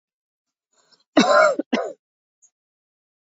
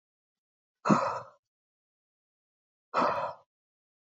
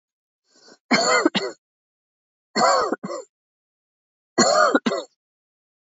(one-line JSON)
{"cough_length": "3.2 s", "cough_amplitude": 27363, "cough_signal_mean_std_ratio": 0.32, "exhalation_length": "4.0 s", "exhalation_amplitude": 10513, "exhalation_signal_mean_std_ratio": 0.31, "three_cough_length": "6.0 s", "three_cough_amplitude": 23423, "three_cough_signal_mean_std_ratio": 0.41, "survey_phase": "alpha (2021-03-01 to 2021-08-12)", "age": "18-44", "gender": "Female", "wearing_mask": "No", "symptom_none": true, "smoker_status": "Never smoked", "respiratory_condition_asthma": false, "respiratory_condition_other": false, "recruitment_source": "REACT", "submission_delay": "1 day", "covid_test_result": "Negative", "covid_test_method": "RT-qPCR"}